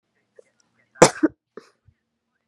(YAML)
cough_length: 2.5 s
cough_amplitude: 32768
cough_signal_mean_std_ratio: 0.17
survey_phase: beta (2021-08-13 to 2022-03-07)
age: 18-44
gender: Female
wearing_mask: 'No'
symptom_none: true
smoker_status: Never smoked
respiratory_condition_asthma: false
respiratory_condition_other: false
recruitment_source: REACT
submission_delay: 3 days
covid_test_result: Negative
covid_test_method: RT-qPCR